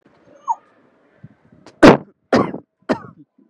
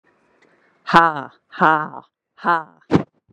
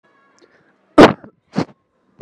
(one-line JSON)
{"three_cough_length": "3.5 s", "three_cough_amplitude": 32768, "three_cough_signal_mean_std_ratio": 0.26, "exhalation_length": "3.3 s", "exhalation_amplitude": 32768, "exhalation_signal_mean_std_ratio": 0.33, "cough_length": "2.2 s", "cough_amplitude": 32768, "cough_signal_mean_std_ratio": 0.23, "survey_phase": "beta (2021-08-13 to 2022-03-07)", "age": "18-44", "gender": "Female", "wearing_mask": "No", "symptom_none": true, "smoker_status": "Ex-smoker", "respiratory_condition_asthma": false, "respiratory_condition_other": false, "recruitment_source": "REACT", "submission_delay": "1 day", "covid_test_result": "Negative", "covid_test_method": "RT-qPCR", "influenza_a_test_result": "Negative", "influenza_b_test_result": "Negative"}